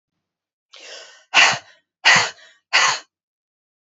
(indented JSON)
{
  "exhalation_length": "3.8 s",
  "exhalation_amplitude": 29975,
  "exhalation_signal_mean_std_ratio": 0.35,
  "survey_phase": "beta (2021-08-13 to 2022-03-07)",
  "age": "45-64",
  "gender": "Female",
  "wearing_mask": "No",
  "symptom_cough_any": true,
  "symptom_runny_or_blocked_nose": true,
  "symptom_sore_throat": true,
  "symptom_fatigue": true,
  "symptom_headache": true,
  "smoker_status": "Never smoked",
  "respiratory_condition_asthma": true,
  "respiratory_condition_other": false,
  "recruitment_source": "Test and Trace",
  "submission_delay": "1 day",
  "covid_test_result": "Positive",
  "covid_test_method": "LFT"
}